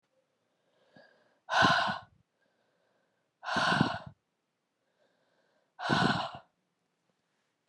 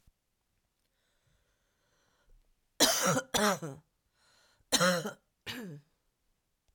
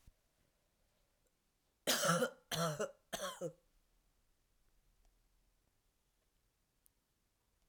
{
  "exhalation_length": "7.7 s",
  "exhalation_amplitude": 11433,
  "exhalation_signal_mean_std_ratio": 0.34,
  "cough_length": "6.7 s",
  "cough_amplitude": 11887,
  "cough_signal_mean_std_ratio": 0.33,
  "three_cough_length": "7.7 s",
  "three_cough_amplitude": 3631,
  "three_cough_signal_mean_std_ratio": 0.3,
  "survey_phase": "alpha (2021-03-01 to 2021-08-12)",
  "age": "45-64",
  "gender": "Female",
  "wearing_mask": "No",
  "symptom_cough_any": true,
  "symptom_new_continuous_cough": true,
  "symptom_fatigue": true,
  "symptom_onset": "5 days",
  "smoker_status": "Ex-smoker",
  "respiratory_condition_asthma": false,
  "respiratory_condition_other": false,
  "recruitment_source": "REACT",
  "submission_delay": "1 day",
  "covid_test_result": "Negative",
  "covid_test_method": "RT-qPCR"
}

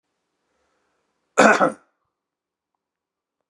{
  "cough_length": "3.5 s",
  "cough_amplitude": 32655,
  "cough_signal_mean_std_ratio": 0.23,
  "survey_phase": "beta (2021-08-13 to 2022-03-07)",
  "age": "45-64",
  "gender": "Male",
  "wearing_mask": "No",
  "symptom_cough_any": true,
  "symptom_sore_throat": true,
  "symptom_headache": true,
  "symptom_onset": "8 days",
  "smoker_status": "Never smoked",
  "respiratory_condition_asthma": false,
  "respiratory_condition_other": false,
  "recruitment_source": "Test and Trace",
  "submission_delay": "1 day",
  "covid_test_result": "Positive",
  "covid_test_method": "RT-qPCR",
  "covid_ct_value": 16.1,
  "covid_ct_gene": "ORF1ab gene"
}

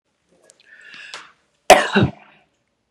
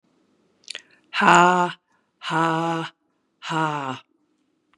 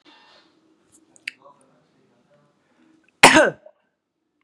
{
  "three_cough_length": "2.9 s",
  "three_cough_amplitude": 32768,
  "three_cough_signal_mean_std_ratio": 0.25,
  "exhalation_length": "4.8 s",
  "exhalation_amplitude": 32767,
  "exhalation_signal_mean_std_ratio": 0.39,
  "cough_length": "4.4 s",
  "cough_amplitude": 32768,
  "cough_signal_mean_std_ratio": 0.19,
  "survey_phase": "beta (2021-08-13 to 2022-03-07)",
  "age": "45-64",
  "gender": "Female",
  "wearing_mask": "No",
  "symptom_runny_or_blocked_nose": true,
  "symptom_onset": "11 days",
  "smoker_status": "Never smoked",
  "respiratory_condition_asthma": false,
  "respiratory_condition_other": false,
  "recruitment_source": "REACT",
  "submission_delay": "2 days",
  "covid_test_result": "Negative",
  "covid_test_method": "RT-qPCR",
  "influenza_a_test_result": "Unknown/Void",
  "influenza_b_test_result": "Unknown/Void"
}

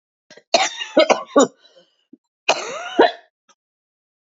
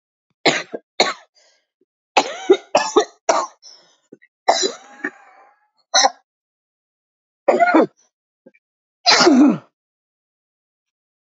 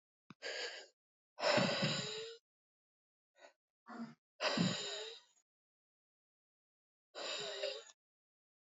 {
  "cough_length": "4.3 s",
  "cough_amplitude": 30402,
  "cough_signal_mean_std_ratio": 0.34,
  "three_cough_length": "11.3 s",
  "three_cough_amplitude": 32767,
  "three_cough_signal_mean_std_ratio": 0.35,
  "exhalation_length": "8.6 s",
  "exhalation_amplitude": 3405,
  "exhalation_signal_mean_std_ratio": 0.42,
  "survey_phase": "alpha (2021-03-01 to 2021-08-12)",
  "age": "45-64",
  "gender": "Female",
  "wearing_mask": "No",
  "symptom_cough_any": true,
  "symptom_shortness_of_breath": true,
  "symptom_headache": true,
  "symptom_change_to_sense_of_smell_or_taste": true,
  "smoker_status": "Current smoker (1 to 10 cigarettes per day)",
  "respiratory_condition_asthma": true,
  "respiratory_condition_other": false,
  "recruitment_source": "Test and Trace",
  "submission_delay": "2 days",
  "covid_test_result": "Positive",
  "covid_test_method": "RT-qPCR",
  "covid_ct_value": 17.1,
  "covid_ct_gene": "ORF1ab gene",
  "covid_ct_mean": 17.5,
  "covid_viral_load": "1800000 copies/ml",
  "covid_viral_load_category": "High viral load (>1M copies/ml)"
}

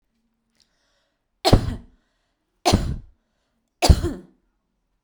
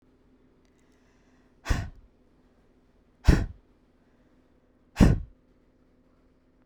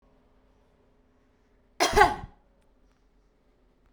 {
  "three_cough_length": "5.0 s",
  "three_cough_amplitude": 32768,
  "three_cough_signal_mean_std_ratio": 0.27,
  "exhalation_length": "6.7 s",
  "exhalation_amplitude": 21420,
  "exhalation_signal_mean_std_ratio": 0.22,
  "cough_length": "3.9 s",
  "cough_amplitude": 22893,
  "cough_signal_mean_std_ratio": 0.22,
  "survey_phase": "beta (2021-08-13 to 2022-03-07)",
  "age": "18-44",
  "gender": "Female",
  "wearing_mask": "No",
  "symptom_none": true,
  "smoker_status": "Ex-smoker",
  "respiratory_condition_asthma": false,
  "respiratory_condition_other": false,
  "recruitment_source": "REACT",
  "submission_delay": "1 day",
  "covid_test_result": "Negative",
  "covid_test_method": "RT-qPCR"
}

